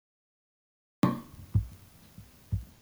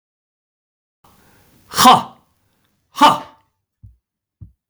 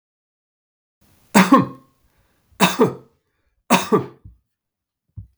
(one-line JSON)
{"cough_length": "2.8 s", "cough_amplitude": 8997, "cough_signal_mean_std_ratio": 0.3, "exhalation_length": "4.7 s", "exhalation_amplitude": 32768, "exhalation_signal_mean_std_ratio": 0.25, "three_cough_length": "5.4 s", "three_cough_amplitude": 32768, "three_cough_signal_mean_std_ratio": 0.3, "survey_phase": "beta (2021-08-13 to 2022-03-07)", "age": "45-64", "gender": "Male", "wearing_mask": "No", "symptom_none": true, "smoker_status": "Never smoked", "respiratory_condition_asthma": true, "respiratory_condition_other": false, "recruitment_source": "REACT", "submission_delay": "2 days", "covid_test_result": "Negative", "covid_test_method": "RT-qPCR", "influenza_a_test_result": "Negative", "influenza_b_test_result": "Negative"}